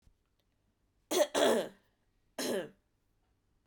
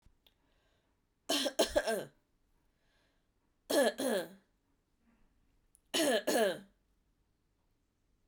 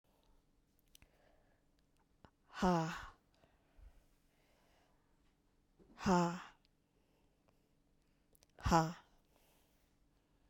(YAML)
cough_length: 3.7 s
cough_amplitude: 6577
cough_signal_mean_std_ratio: 0.36
three_cough_length: 8.3 s
three_cough_amplitude: 5119
three_cough_signal_mean_std_ratio: 0.36
exhalation_length: 10.5 s
exhalation_amplitude: 4297
exhalation_signal_mean_std_ratio: 0.26
survey_phase: beta (2021-08-13 to 2022-03-07)
age: 18-44
gender: Female
wearing_mask: 'No'
symptom_runny_or_blocked_nose: true
symptom_sore_throat: true
symptom_fatigue: true
symptom_headache: true
smoker_status: Never smoked
respiratory_condition_asthma: false
respiratory_condition_other: false
recruitment_source: Test and Trace
submission_delay: 2 days
covid_test_result: Positive
covid_test_method: ePCR